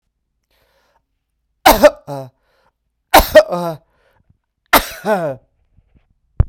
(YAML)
three_cough_length: 6.5 s
three_cough_amplitude: 32768
three_cough_signal_mean_std_ratio: 0.29
survey_phase: beta (2021-08-13 to 2022-03-07)
age: 45-64
gender: Male
wearing_mask: 'No'
symptom_none: true
smoker_status: Never smoked
respiratory_condition_asthma: false
respiratory_condition_other: false
recruitment_source: REACT
submission_delay: 1 day
covid_test_result: Negative
covid_test_method: RT-qPCR
influenza_a_test_result: Negative
influenza_b_test_result: Negative